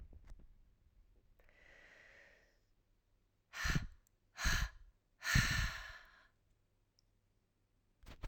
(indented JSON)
{
  "exhalation_length": "8.3 s",
  "exhalation_amplitude": 3827,
  "exhalation_signal_mean_std_ratio": 0.34,
  "survey_phase": "alpha (2021-03-01 to 2021-08-12)",
  "age": "18-44",
  "gender": "Female",
  "wearing_mask": "No",
  "symptom_cough_any": true,
  "symptom_headache": true,
  "symptom_change_to_sense_of_smell_or_taste": true,
  "smoker_status": "Never smoked",
  "respiratory_condition_asthma": false,
  "respiratory_condition_other": false,
  "recruitment_source": "Test and Trace",
  "submission_delay": "2 days",
  "covid_test_result": "Positive",
  "covid_test_method": "RT-qPCR",
  "covid_ct_value": 18.9,
  "covid_ct_gene": "N gene",
  "covid_ct_mean": 20.0,
  "covid_viral_load": "280000 copies/ml",
  "covid_viral_load_category": "Low viral load (10K-1M copies/ml)"
}